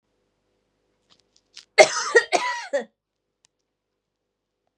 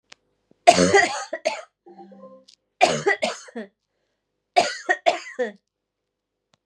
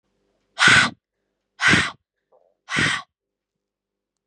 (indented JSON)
{
  "cough_length": "4.8 s",
  "cough_amplitude": 32768,
  "cough_signal_mean_std_ratio": 0.24,
  "three_cough_length": "6.7 s",
  "three_cough_amplitude": 32768,
  "three_cough_signal_mean_std_ratio": 0.35,
  "exhalation_length": "4.3 s",
  "exhalation_amplitude": 28652,
  "exhalation_signal_mean_std_ratio": 0.34,
  "survey_phase": "beta (2021-08-13 to 2022-03-07)",
  "age": "18-44",
  "gender": "Female",
  "wearing_mask": "No",
  "symptom_cough_any": true,
  "symptom_runny_or_blocked_nose": true,
  "symptom_fatigue": true,
  "symptom_fever_high_temperature": true,
  "symptom_onset": "2 days",
  "smoker_status": "Never smoked",
  "respiratory_condition_asthma": false,
  "respiratory_condition_other": false,
  "recruitment_source": "Test and Trace",
  "submission_delay": "1 day",
  "covid_test_result": "Positive",
  "covid_test_method": "RT-qPCR",
  "covid_ct_value": 23.8,
  "covid_ct_gene": "ORF1ab gene",
  "covid_ct_mean": 24.5,
  "covid_viral_load": "9100 copies/ml",
  "covid_viral_load_category": "Minimal viral load (< 10K copies/ml)"
}